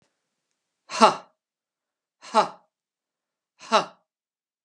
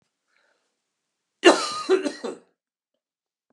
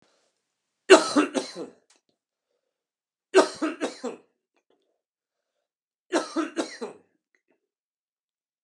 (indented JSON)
{
  "exhalation_length": "4.6 s",
  "exhalation_amplitude": 31286,
  "exhalation_signal_mean_std_ratio": 0.21,
  "cough_length": "3.5 s",
  "cough_amplitude": 29974,
  "cough_signal_mean_std_ratio": 0.27,
  "three_cough_length": "8.6 s",
  "three_cough_amplitude": 32542,
  "three_cough_signal_mean_std_ratio": 0.24,
  "survey_phase": "beta (2021-08-13 to 2022-03-07)",
  "age": "45-64",
  "gender": "Male",
  "wearing_mask": "No",
  "symptom_other": true,
  "smoker_status": "Never smoked",
  "respiratory_condition_asthma": true,
  "respiratory_condition_other": false,
  "recruitment_source": "REACT",
  "submission_delay": "2 days",
  "covid_test_result": "Negative",
  "covid_test_method": "RT-qPCR",
  "influenza_a_test_result": "Negative",
  "influenza_b_test_result": "Negative"
}